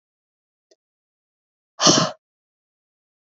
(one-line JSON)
{"exhalation_length": "3.2 s", "exhalation_amplitude": 28542, "exhalation_signal_mean_std_ratio": 0.22, "survey_phase": "beta (2021-08-13 to 2022-03-07)", "age": "18-44", "gender": "Female", "wearing_mask": "No", "symptom_none": true, "smoker_status": "Ex-smoker", "respiratory_condition_asthma": false, "respiratory_condition_other": false, "recruitment_source": "REACT", "submission_delay": "3 days", "covid_test_result": "Negative", "covid_test_method": "RT-qPCR", "influenza_a_test_result": "Unknown/Void", "influenza_b_test_result": "Unknown/Void"}